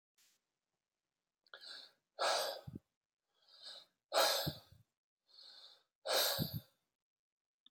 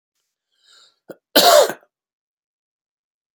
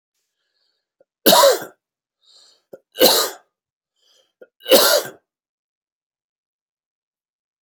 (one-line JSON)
{"exhalation_length": "7.7 s", "exhalation_amplitude": 3485, "exhalation_signal_mean_std_ratio": 0.35, "cough_length": "3.3 s", "cough_amplitude": 32767, "cough_signal_mean_std_ratio": 0.26, "three_cough_length": "7.6 s", "three_cough_amplitude": 32768, "three_cough_signal_mean_std_ratio": 0.28, "survey_phase": "beta (2021-08-13 to 2022-03-07)", "age": "45-64", "gender": "Male", "wearing_mask": "No", "symptom_cough_any": true, "symptom_runny_or_blocked_nose": true, "symptom_fatigue": true, "symptom_headache": true, "symptom_onset": "2 days", "smoker_status": "Current smoker (e-cigarettes or vapes only)", "respiratory_condition_asthma": false, "respiratory_condition_other": false, "recruitment_source": "Test and Trace", "submission_delay": "2 days", "covid_test_result": "Positive", "covid_test_method": "RT-qPCR", "covid_ct_value": 18.8, "covid_ct_gene": "N gene", "covid_ct_mean": 19.5, "covid_viral_load": "410000 copies/ml", "covid_viral_load_category": "Low viral load (10K-1M copies/ml)"}